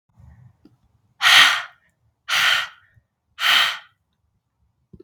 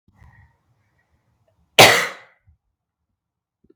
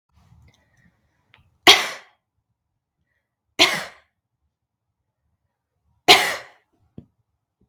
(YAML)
exhalation_length: 5.0 s
exhalation_amplitude: 32766
exhalation_signal_mean_std_ratio: 0.36
cough_length: 3.8 s
cough_amplitude: 32768
cough_signal_mean_std_ratio: 0.21
three_cough_length: 7.7 s
three_cough_amplitude: 32768
three_cough_signal_mean_std_ratio: 0.2
survey_phase: beta (2021-08-13 to 2022-03-07)
age: 18-44
gender: Female
wearing_mask: 'No'
symptom_shortness_of_breath: true
symptom_abdominal_pain: true
symptom_fatigue: true
symptom_fever_high_temperature: true
symptom_change_to_sense_of_smell_or_taste: true
symptom_loss_of_taste: true
symptom_onset: 4 days
smoker_status: Current smoker (1 to 10 cigarettes per day)
respiratory_condition_asthma: false
respiratory_condition_other: false
recruitment_source: Test and Trace
submission_delay: 1 day
covid_test_result: Positive
covid_test_method: RT-qPCR